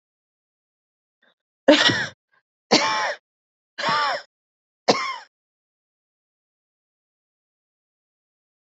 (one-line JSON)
{"three_cough_length": "8.7 s", "three_cough_amplitude": 27267, "three_cough_signal_mean_std_ratio": 0.29, "survey_phase": "beta (2021-08-13 to 2022-03-07)", "age": "45-64", "gender": "Female", "wearing_mask": "No", "symptom_cough_any": true, "symptom_runny_or_blocked_nose": true, "symptom_shortness_of_breath": true, "symptom_fatigue": true, "symptom_headache": true, "symptom_onset": "3 days", "smoker_status": "Ex-smoker", "respiratory_condition_asthma": false, "respiratory_condition_other": false, "recruitment_source": "Test and Trace", "submission_delay": "1 day", "covid_test_result": "Positive", "covid_test_method": "ePCR"}